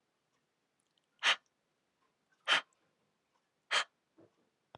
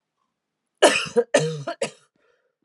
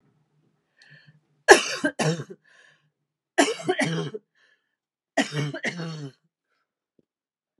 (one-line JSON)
{"exhalation_length": "4.8 s", "exhalation_amplitude": 5595, "exhalation_signal_mean_std_ratio": 0.22, "cough_length": "2.6 s", "cough_amplitude": 30163, "cough_signal_mean_std_ratio": 0.36, "three_cough_length": "7.6 s", "three_cough_amplitude": 32768, "three_cough_signal_mean_std_ratio": 0.3, "survey_phase": "beta (2021-08-13 to 2022-03-07)", "age": "18-44", "gender": "Female", "wearing_mask": "No", "symptom_runny_or_blocked_nose": true, "symptom_shortness_of_breath": true, "symptom_headache": true, "symptom_onset": "12 days", "smoker_status": "Never smoked", "respiratory_condition_asthma": true, "respiratory_condition_other": false, "recruitment_source": "REACT", "submission_delay": "3 days", "covid_test_result": "Negative", "covid_test_method": "RT-qPCR"}